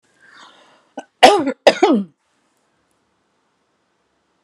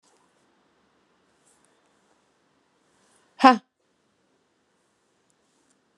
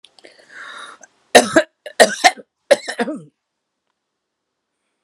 cough_length: 4.4 s
cough_amplitude: 32768
cough_signal_mean_std_ratio: 0.27
exhalation_length: 6.0 s
exhalation_amplitude: 32709
exhalation_signal_mean_std_ratio: 0.12
three_cough_length: 5.0 s
three_cough_amplitude: 32768
three_cough_signal_mean_std_ratio: 0.26
survey_phase: alpha (2021-03-01 to 2021-08-12)
age: 45-64
gender: Female
wearing_mask: 'No'
symptom_none: true
smoker_status: Ex-smoker
respiratory_condition_asthma: false
respiratory_condition_other: false
recruitment_source: REACT
submission_delay: 2 days
covid_test_result: Negative
covid_test_method: RT-qPCR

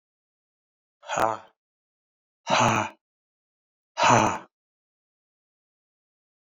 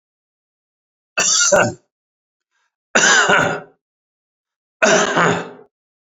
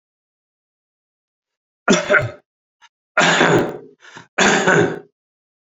exhalation_length: 6.5 s
exhalation_amplitude: 20325
exhalation_signal_mean_std_ratio: 0.3
cough_length: 6.1 s
cough_amplitude: 28866
cough_signal_mean_std_ratio: 0.45
three_cough_length: 5.6 s
three_cough_amplitude: 32767
three_cough_signal_mean_std_ratio: 0.42
survey_phase: beta (2021-08-13 to 2022-03-07)
age: 45-64
gender: Male
wearing_mask: 'No'
symptom_none: true
smoker_status: Ex-smoker
respiratory_condition_asthma: false
respiratory_condition_other: false
recruitment_source: REACT
submission_delay: 6 days
covid_test_result: Negative
covid_test_method: RT-qPCR
influenza_a_test_result: Unknown/Void
influenza_b_test_result: Unknown/Void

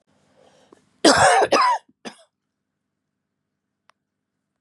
cough_length: 4.6 s
cough_amplitude: 31527
cough_signal_mean_std_ratio: 0.32
survey_phase: beta (2021-08-13 to 2022-03-07)
age: 45-64
gender: Female
wearing_mask: 'No'
symptom_cough_any: true
symptom_runny_or_blocked_nose: true
symptom_shortness_of_breath: true
symptom_fatigue: true
symptom_headache: true
symptom_change_to_sense_of_smell_or_taste: true
symptom_onset: 2 days
smoker_status: Never smoked
respiratory_condition_asthma: true
respiratory_condition_other: false
recruitment_source: Test and Trace
submission_delay: 2 days
covid_test_result: Positive
covid_test_method: RT-qPCR
covid_ct_value: 21.5
covid_ct_gene: ORF1ab gene
covid_ct_mean: 21.7
covid_viral_load: 76000 copies/ml
covid_viral_load_category: Low viral load (10K-1M copies/ml)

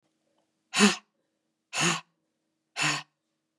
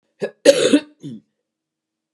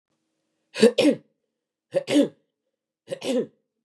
exhalation_length: 3.6 s
exhalation_amplitude: 14729
exhalation_signal_mean_std_ratio: 0.32
cough_length: 2.1 s
cough_amplitude: 32768
cough_signal_mean_std_ratio: 0.32
three_cough_length: 3.8 s
three_cough_amplitude: 22950
three_cough_signal_mean_std_ratio: 0.34
survey_phase: beta (2021-08-13 to 2022-03-07)
age: 45-64
gender: Female
wearing_mask: 'No'
symptom_cough_any: true
symptom_runny_or_blocked_nose: true
symptom_sore_throat: true
smoker_status: Never smoked
respiratory_condition_asthma: false
respiratory_condition_other: false
recruitment_source: Test and Trace
submission_delay: 1 day
covid_test_result: Positive
covid_test_method: ePCR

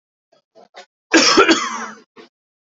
cough_length: 2.6 s
cough_amplitude: 28867
cough_signal_mean_std_ratio: 0.39
survey_phase: beta (2021-08-13 to 2022-03-07)
age: 18-44
gender: Male
wearing_mask: 'No'
symptom_cough_any: true
symptom_onset: 4 days
smoker_status: Never smoked
respiratory_condition_asthma: false
respiratory_condition_other: false
recruitment_source: Test and Trace
submission_delay: 2 days
covid_test_result: Positive
covid_test_method: RT-qPCR
covid_ct_value: 17.8
covid_ct_gene: S gene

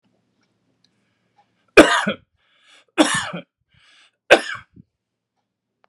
three_cough_length: 5.9 s
three_cough_amplitude: 32768
three_cough_signal_mean_std_ratio: 0.23
survey_phase: beta (2021-08-13 to 2022-03-07)
age: 45-64
gender: Male
wearing_mask: 'No'
symptom_none: true
symptom_onset: 13 days
smoker_status: Ex-smoker
respiratory_condition_asthma: false
respiratory_condition_other: false
recruitment_source: REACT
submission_delay: 3 days
covid_test_result: Negative
covid_test_method: RT-qPCR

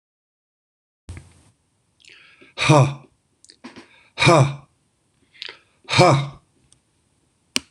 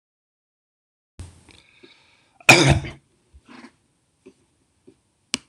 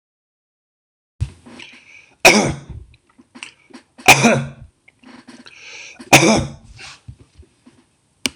exhalation_length: 7.7 s
exhalation_amplitude: 26028
exhalation_signal_mean_std_ratio: 0.3
cough_length: 5.5 s
cough_amplitude: 26028
cough_signal_mean_std_ratio: 0.2
three_cough_length: 8.4 s
three_cough_amplitude: 26028
three_cough_signal_mean_std_ratio: 0.3
survey_phase: beta (2021-08-13 to 2022-03-07)
age: 65+
gender: Male
wearing_mask: 'No'
symptom_none: true
smoker_status: Never smoked
respiratory_condition_asthma: false
respiratory_condition_other: false
recruitment_source: REACT
submission_delay: 1 day
covid_test_result: Negative
covid_test_method: RT-qPCR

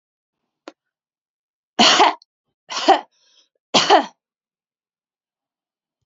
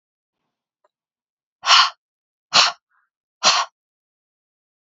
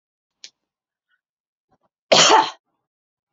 three_cough_length: 6.1 s
three_cough_amplitude: 30487
three_cough_signal_mean_std_ratio: 0.29
exhalation_length: 4.9 s
exhalation_amplitude: 32767
exhalation_signal_mean_std_ratio: 0.27
cough_length: 3.3 s
cough_amplitude: 32767
cough_signal_mean_std_ratio: 0.26
survey_phase: beta (2021-08-13 to 2022-03-07)
age: 18-44
gender: Female
wearing_mask: 'No'
symptom_none: true
smoker_status: Never smoked
respiratory_condition_asthma: false
respiratory_condition_other: false
recruitment_source: REACT
submission_delay: 1 day
covid_test_result: Negative
covid_test_method: RT-qPCR
influenza_a_test_result: Negative
influenza_b_test_result: Negative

